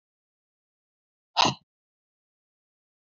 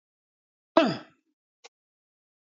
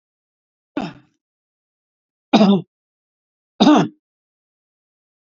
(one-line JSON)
{"exhalation_length": "3.2 s", "exhalation_amplitude": 15886, "exhalation_signal_mean_std_ratio": 0.16, "cough_length": "2.5 s", "cough_amplitude": 19203, "cough_signal_mean_std_ratio": 0.2, "three_cough_length": "5.3 s", "three_cough_amplitude": 28217, "three_cough_signal_mean_std_ratio": 0.27, "survey_phase": "beta (2021-08-13 to 2022-03-07)", "age": "65+", "gender": "Male", "wearing_mask": "No", "symptom_none": true, "smoker_status": "Never smoked", "respiratory_condition_asthma": false, "respiratory_condition_other": false, "recruitment_source": "REACT", "submission_delay": "14 days", "covid_test_result": "Negative", "covid_test_method": "RT-qPCR", "influenza_a_test_result": "Negative", "influenza_b_test_result": "Negative"}